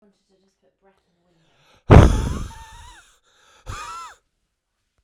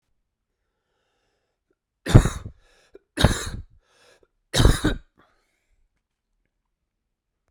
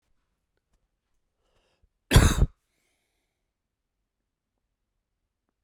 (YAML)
exhalation_length: 5.0 s
exhalation_amplitude: 32768
exhalation_signal_mean_std_ratio: 0.23
three_cough_length: 7.5 s
three_cough_amplitude: 32768
three_cough_signal_mean_std_ratio: 0.23
cough_length: 5.6 s
cough_amplitude: 22134
cough_signal_mean_std_ratio: 0.18
survey_phase: beta (2021-08-13 to 2022-03-07)
age: 45-64
gender: Male
wearing_mask: 'No'
symptom_cough_any: true
symptom_runny_or_blocked_nose: true
symptom_shortness_of_breath: true
symptom_fatigue: true
symptom_headache: true
symptom_onset: 5 days
smoker_status: Ex-smoker
respiratory_condition_asthma: false
respiratory_condition_other: false
recruitment_source: Test and Trace
submission_delay: 2 days
covid_test_result: Positive
covid_test_method: ePCR